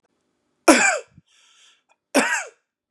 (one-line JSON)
{"cough_length": "2.9 s", "cough_amplitude": 32767, "cough_signal_mean_std_ratio": 0.33, "survey_phase": "beta (2021-08-13 to 2022-03-07)", "age": "18-44", "gender": "Male", "wearing_mask": "No", "symptom_none": true, "smoker_status": "Current smoker (1 to 10 cigarettes per day)", "respiratory_condition_asthma": false, "respiratory_condition_other": false, "recruitment_source": "REACT", "submission_delay": "1 day", "covid_test_result": "Negative", "covid_test_method": "RT-qPCR", "influenza_a_test_result": "Negative", "influenza_b_test_result": "Negative"}